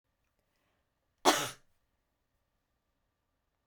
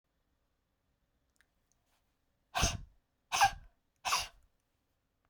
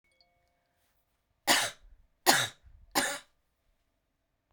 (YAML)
cough_length: 3.7 s
cough_amplitude: 12357
cough_signal_mean_std_ratio: 0.17
exhalation_length: 5.3 s
exhalation_amplitude: 6240
exhalation_signal_mean_std_ratio: 0.26
three_cough_length: 4.5 s
three_cough_amplitude: 17040
three_cough_signal_mean_std_ratio: 0.28
survey_phase: beta (2021-08-13 to 2022-03-07)
age: 45-64
gender: Female
wearing_mask: 'No'
symptom_none: true
smoker_status: Never smoked
respiratory_condition_asthma: false
respiratory_condition_other: false
recruitment_source: REACT
submission_delay: 1 day
covid_test_result: Negative
covid_test_method: RT-qPCR